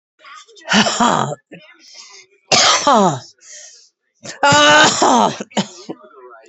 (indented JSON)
{
  "exhalation_length": "6.5 s",
  "exhalation_amplitude": 32767,
  "exhalation_signal_mean_std_ratio": 0.51,
  "survey_phase": "beta (2021-08-13 to 2022-03-07)",
  "age": "45-64",
  "gender": "Female",
  "wearing_mask": "No",
  "symptom_cough_any": true,
  "symptom_new_continuous_cough": true,
  "symptom_runny_or_blocked_nose": true,
  "symptom_shortness_of_breath": true,
  "symptom_sore_throat": true,
  "symptom_fatigue": true,
  "symptom_headache": true,
  "symptom_onset": "3 days",
  "smoker_status": "Never smoked",
  "respiratory_condition_asthma": true,
  "respiratory_condition_other": false,
  "recruitment_source": "Test and Trace",
  "submission_delay": "1 day",
  "covid_test_result": "Negative",
  "covid_test_method": "RT-qPCR"
}